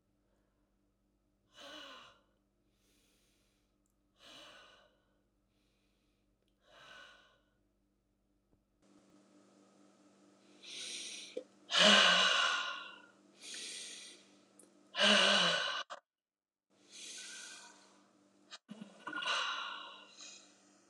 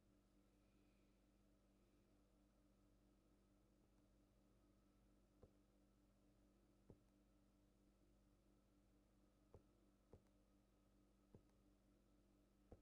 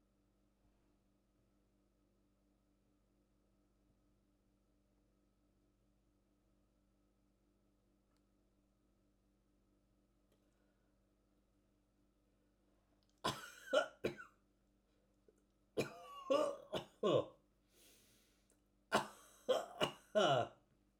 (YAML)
exhalation_length: 20.9 s
exhalation_amplitude: 7939
exhalation_signal_mean_std_ratio: 0.31
three_cough_length: 12.8 s
three_cough_amplitude: 120
three_cough_signal_mean_std_ratio: 0.96
cough_length: 21.0 s
cough_amplitude: 2781
cough_signal_mean_std_ratio: 0.25
survey_phase: alpha (2021-03-01 to 2021-08-12)
age: 65+
gender: Male
wearing_mask: 'No'
symptom_none: true
symptom_shortness_of_breath: true
symptom_onset: 12 days
smoker_status: Ex-smoker
respiratory_condition_asthma: true
respiratory_condition_other: false
recruitment_source: REACT
submission_delay: 2 days
covid_test_result: Negative
covid_test_method: RT-qPCR